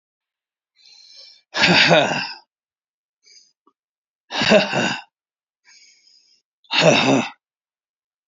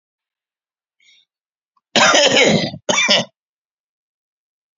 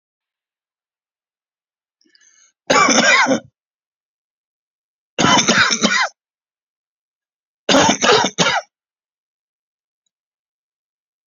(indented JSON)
{
  "exhalation_length": "8.3 s",
  "exhalation_amplitude": 30928,
  "exhalation_signal_mean_std_ratio": 0.37,
  "cough_length": "4.8 s",
  "cough_amplitude": 32767,
  "cough_signal_mean_std_ratio": 0.39,
  "three_cough_length": "11.3 s",
  "three_cough_amplitude": 32768,
  "three_cough_signal_mean_std_ratio": 0.36,
  "survey_phase": "alpha (2021-03-01 to 2021-08-12)",
  "age": "45-64",
  "gender": "Male",
  "wearing_mask": "No",
  "symptom_abdominal_pain": true,
  "symptom_diarrhoea": true,
  "symptom_onset": "5 days",
  "smoker_status": "Ex-smoker",
  "respiratory_condition_asthma": false,
  "respiratory_condition_other": false,
  "recruitment_source": "REACT",
  "submission_delay": "3 days",
  "covid_test_result": "Negative",
  "covid_test_method": "RT-qPCR"
}